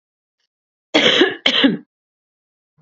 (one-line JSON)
{"cough_length": "2.8 s", "cough_amplitude": 31575, "cough_signal_mean_std_ratio": 0.4, "survey_phase": "beta (2021-08-13 to 2022-03-07)", "age": "18-44", "gender": "Female", "wearing_mask": "No", "symptom_none": true, "smoker_status": "Never smoked", "respiratory_condition_asthma": false, "respiratory_condition_other": false, "recruitment_source": "Test and Trace", "submission_delay": "1 day", "covid_test_result": "Positive", "covid_test_method": "RT-qPCR", "covid_ct_value": 29.8, "covid_ct_gene": "ORF1ab gene"}